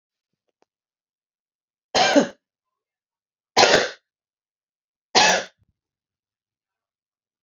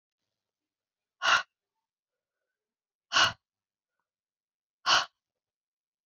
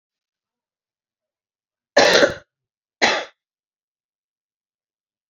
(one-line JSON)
{"three_cough_length": "7.4 s", "three_cough_amplitude": 31687, "three_cough_signal_mean_std_ratio": 0.27, "exhalation_length": "6.1 s", "exhalation_amplitude": 9927, "exhalation_signal_mean_std_ratio": 0.23, "cough_length": "5.3 s", "cough_amplitude": 30186, "cough_signal_mean_std_ratio": 0.24, "survey_phase": "beta (2021-08-13 to 2022-03-07)", "age": "18-44", "gender": "Female", "wearing_mask": "Yes", "symptom_headache": true, "symptom_onset": "4 days", "smoker_status": "Current smoker (1 to 10 cigarettes per day)", "respiratory_condition_asthma": false, "respiratory_condition_other": false, "recruitment_source": "Test and Trace", "submission_delay": "2 days", "covid_test_result": "Positive", "covid_test_method": "RT-qPCR", "covid_ct_value": 15.5, "covid_ct_gene": "ORF1ab gene", "covid_ct_mean": 15.9, "covid_viral_load": "6100000 copies/ml", "covid_viral_load_category": "High viral load (>1M copies/ml)"}